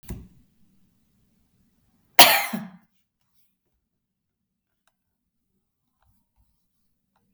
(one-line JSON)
{"cough_length": "7.3 s", "cough_amplitude": 32768, "cough_signal_mean_std_ratio": 0.15, "survey_phase": "beta (2021-08-13 to 2022-03-07)", "age": "45-64", "gender": "Female", "wearing_mask": "No", "symptom_none": true, "symptom_onset": "11 days", "smoker_status": "Never smoked", "respiratory_condition_asthma": false, "respiratory_condition_other": false, "recruitment_source": "REACT", "submission_delay": "2 days", "covid_test_result": "Negative", "covid_test_method": "RT-qPCR", "influenza_a_test_result": "Negative", "influenza_b_test_result": "Negative"}